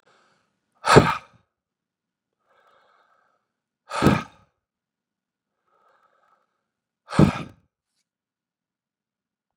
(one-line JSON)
{"exhalation_length": "9.6 s", "exhalation_amplitude": 32768, "exhalation_signal_mean_std_ratio": 0.19, "survey_phase": "beta (2021-08-13 to 2022-03-07)", "age": "45-64", "gender": "Male", "wearing_mask": "No", "symptom_none": true, "smoker_status": "Never smoked", "respiratory_condition_asthma": false, "respiratory_condition_other": false, "recruitment_source": "Test and Trace", "submission_delay": "1 day", "covid_test_result": "Negative", "covid_test_method": "RT-qPCR"}